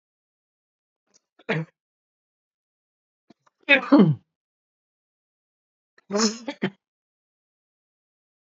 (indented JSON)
{
  "three_cough_length": "8.4 s",
  "three_cough_amplitude": 25668,
  "three_cough_signal_mean_std_ratio": 0.22,
  "survey_phase": "beta (2021-08-13 to 2022-03-07)",
  "age": "45-64",
  "gender": "Male",
  "wearing_mask": "No",
  "symptom_cough_any": true,
  "symptom_onset": "5 days",
  "smoker_status": "Ex-smoker",
  "respiratory_condition_asthma": false,
  "respiratory_condition_other": false,
  "recruitment_source": "Test and Trace",
  "submission_delay": "2 days",
  "covid_test_result": "Positive",
  "covid_test_method": "RT-qPCR",
  "covid_ct_value": 30.8,
  "covid_ct_gene": "ORF1ab gene"
}